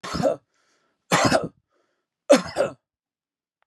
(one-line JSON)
{"three_cough_length": "3.7 s", "three_cough_amplitude": 27400, "three_cough_signal_mean_std_ratio": 0.36, "survey_phase": "beta (2021-08-13 to 2022-03-07)", "age": "45-64", "gender": "Male", "wearing_mask": "No", "symptom_none": true, "smoker_status": "Ex-smoker", "respiratory_condition_asthma": false, "respiratory_condition_other": false, "recruitment_source": "REACT", "submission_delay": "1 day", "covid_test_result": "Negative", "covid_test_method": "RT-qPCR", "influenza_a_test_result": "Negative", "influenza_b_test_result": "Negative"}